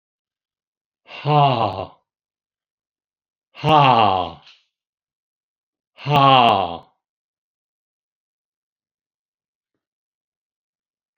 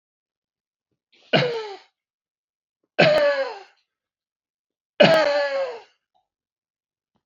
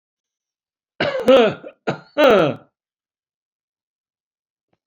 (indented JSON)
{
  "exhalation_length": "11.2 s",
  "exhalation_amplitude": 28350,
  "exhalation_signal_mean_std_ratio": 0.31,
  "three_cough_length": "7.3 s",
  "three_cough_amplitude": 28000,
  "three_cough_signal_mean_std_ratio": 0.36,
  "cough_length": "4.9 s",
  "cough_amplitude": 27196,
  "cough_signal_mean_std_ratio": 0.34,
  "survey_phase": "beta (2021-08-13 to 2022-03-07)",
  "age": "65+",
  "gender": "Male",
  "wearing_mask": "No",
  "symptom_none": true,
  "smoker_status": "Never smoked",
  "respiratory_condition_asthma": false,
  "respiratory_condition_other": false,
  "recruitment_source": "REACT",
  "submission_delay": "1 day",
  "covid_test_result": "Negative",
  "covid_test_method": "RT-qPCR"
}